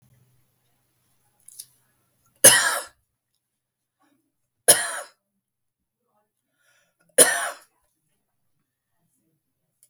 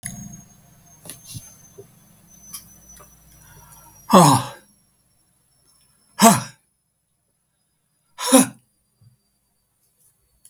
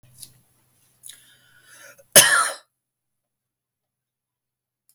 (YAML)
three_cough_length: 9.9 s
three_cough_amplitude: 32768
three_cough_signal_mean_std_ratio: 0.2
exhalation_length: 10.5 s
exhalation_amplitude: 32768
exhalation_signal_mean_std_ratio: 0.23
cough_length: 4.9 s
cough_amplitude: 32768
cough_signal_mean_std_ratio: 0.2
survey_phase: beta (2021-08-13 to 2022-03-07)
age: 65+
gender: Male
wearing_mask: 'No'
symptom_none: true
symptom_onset: 13 days
smoker_status: Never smoked
respiratory_condition_asthma: true
respiratory_condition_other: false
recruitment_source: REACT
submission_delay: 3 days
covid_test_result: Negative
covid_test_method: RT-qPCR
influenza_a_test_result: Negative
influenza_b_test_result: Negative